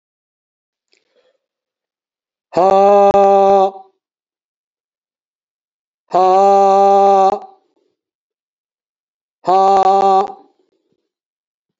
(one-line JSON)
{"exhalation_length": "11.8 s", "exhalation_amplitude": 29484, "exhalation_signal_mean_std_ratio": 0.45, "survey_phase": "alpha (2021-03-01 to 2021-08-12)", "age": "65+", "gender": "Male", "wearing_mask": "No", "symptom_none": true, "smoker_status": "Ex-smoker", "respiratory_condition_asthma": false, "respiratory_condition_other": false, "recruitment_source": "REACT", "submission_delay": "1 day", "covid_test_result": "Negative", "covid_test_method": "RT-qPCR"}